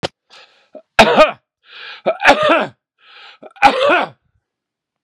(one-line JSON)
{"three_cough_length": "5.0 s", "three_cough_amplitude": 32768, "three_cough_signal_mean_std_ratio": 0.4, "survey_phase": "beta (2021-08-13 to 2022-03-07)", "age": "45-64", "gender": "Male", "wearing_mask": "No", "symptom_none": true, "smoker_status": "Never smoked", "respiratory_condition_asthma": false, "respiratory_condition_other": false, "recruitment_source": "REACT", "submission_delay": "2 days", "covid_test_result": "Negative", "covid_test_method": "RT-qPCR", "influenza_a_test_result": "Negative", "influenza_b_test_result": "Negative"}